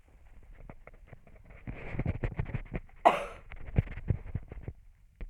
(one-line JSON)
{"three_cough_length": "5.3 s", "three_cough_amplitude": 12794, "three_cough_signal_mean_std_ratio": 0.44, "survey_phase": "alpha (2021-03-01 to 2021-08-12)", "age": "65+", "gender": "Female", "wearing_mask": "No", "symptom_none": true, "smoker_status": "Never smoked", "respiratory_condition_asthma": false, "respiratory_condition_other": false, "recruitment_source": "REACT", "submission_delay": "1 day", "covid_test_result": "Negative", "covid_test_method": "RT-qPCR"}